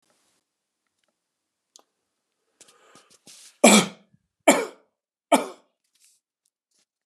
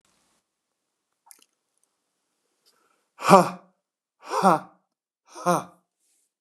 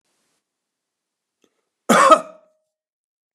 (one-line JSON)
{"three_cough_length": "7.1 s", "three_cough_amplitude": 28464, "three_cough_signal_mean_std_ratio": 0.2, "exhalation_length": "6.4 s", "exhalation_amplitude": 29222, "exhalation_signal_mean_std_ratio": 0.21, "cough_length": "3.3 s", "cough_amplitude": 29235, "cough_signal_mean_std_ratio": 0.24, "survey_phase": "beta (2021-08-13 to 2022-03-07)", "age": "45-64", "gender": "Male", "wearing_mask": "No", "symptom_none": true, "smoker_status": "Never smoked", "respiratory_condition_asthma": false, "respiratory_condition_other": false, "recruitment_source": "REACT", "submission_delay": "0 days", "covid_test_result": "Negative", "covid_test_method": "RT-qPCR", "influenza_a_test_result": "Unknown/Void", "influenza_b_test_result": "Unknown/Void"}